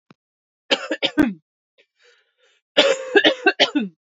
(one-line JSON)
{"cough_length": "4.2 s", "cough_amplitude": 31347, "cough_signal_mean_std_ratio": 0.39, "survey_phase": "beta (2021-08-13 to 2022-03-07)", "age": "18-44", "gender": "Female", "wearing_mask": "No", "symptom_cough_any": true, "symptom_runny_or_blocked_nose": true, "symptom_sore_throat": true, "symptom_headache": true, "symptom_onset": "3 days", "smoker_status": "Never smoked", "respiratory_condition_asthma": false, "respiratory_condition_other": false, "recruitment_source": "Test and Trace", "submission_delay": "1 day", "covid_test_result": "Negative", "covid_test_method": "ePCR"}